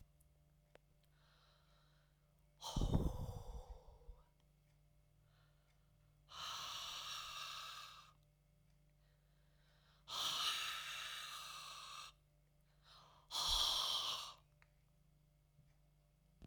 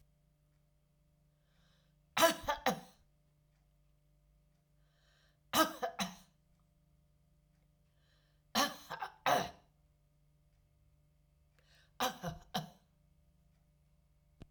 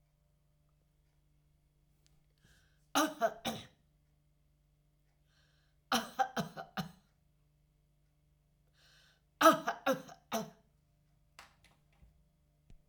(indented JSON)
{
  "exhalation_length": "16.5 s",
  "exhalation_amplitude": 2243,
  "exhalation_signal_mean_std_ratio": 0.46,
  "cough_length": "14.5 s",
  "cough_amplitude": 6549,
  "cough_signal_mean_std_ratio": 0.26,
  "three_cough_length": "12.9 s",
  "three_cough_amplitude": 9983,
  "three_cough_signal_mean_std_ratio": 0.23,
  "survey_phase": "alpha (2021-03-01 to 2021-08-12)",
  "age": "65+",
  "gender": "Female",
  "wearing_mask": "No",
  "symptom_none": true,
  "smoker_status": "Never smoked",
  "respiratory_condition_asthma": false,
  "respiratory_condition_other": false,
  "recruitment_source": "REACT",
  "submission_delay": "1 day",
  "covid_test_result": "Negative",
  "covid_test_method": "RT-qPCR"
}